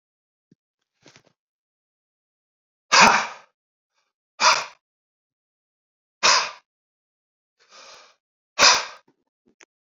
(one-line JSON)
{"exhalation_length": "9.9 s", "exhalation_amplitude": 29362, "exhalation_signal_mean_std_ratio": 0.25, "survey_phase": "alpha (2021-03-01 to 2021-08-12)", "age": "45-64", "gender": "Male", "wearing_mask": "No", "symptom_cough_any": true, "symptom_shortness_of_breath": true, "symptom_fatigue": true, "symptom_fever_high_temperature": true, "symptom_headache": true, "symptom_change_to_sense_of_smell_or_taste": true, "symptom_loss_of_taste": true, "smoker_status": "Never smoked", "respiratory_condition_asthma": false, "respiratory_condition_other": false, "recruitment_source": "Test and Trace", "submission_delay": "2 days", "covid_test_result": "Positive", "covid_test_method": "LFT"}